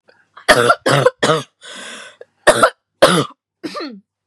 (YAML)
three_cough_length: 4.3 s
three_cough_amplitude: 32768
three_cough_signal_mean_std_ratio: 0.44
survey_phase: beta (2021-08-13 to 2022-03-07)
age: 18-44
gender: Female
wearing_mask: 'No'
symptom_cough_any: true
symptom_new_continuous_cough: true
symptom_runny_or_blocked_nose: true
symptom_shortness_of_breath: true
symptom_sore_throat: true
symptom_abdominal_pain: true
symptom_diarrhoea: true
symptom_fatigue: true
symptom_headache: true
symptom_change_to_sense_of_smell_or_taste: true
symptom_loss_of_taste: true
symptom_onset: 4 days
smoker_status: Never smoked
respiratory_condition_asthma: true
respiratory_condition_other: false
recruitment_source: Test and Trace
submission_delay: 1 day
covid_test_result: Positive
covid_test_method: RT-qPCR
covid_ct_value: 25.0
covid_ct_gene: ORF1ab gene